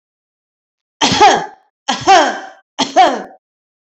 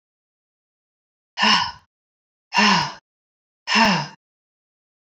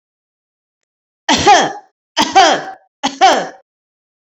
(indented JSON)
{
  "cough_length": "3.8 s",
  "cough_amplitude": 29663,
  "cough_signal_mean_std_ratio": 0.45,
  "exhalation_length": "5.0 s",
  "exhalation_amplitude": 22315,
  "exhalation_signal_mean_std_ratio": 0.36,
  "three_cough_length": "4.3 s",
  "three_cough_amplitude": 30142,
  "three_cough_signal_mean_std_ratio": 0.43,
  "survey_phase": "beta (2021-08-13 to 2022-03-07)",
  "age": "45-64",
  "gender": "Female",
  "wearing_mask": "No",
  "symptom_none": true,
  "smoker_status": "Never smoked",
  "respiratory_condition_asthma": true,
  "respiratory_condition_other": false,
  "recruitment_source": "REACT",
  "submission_delay": "2 days",
  "covid_test_result": "Negative",
  "covid_test_method": "RT-qPCR"
}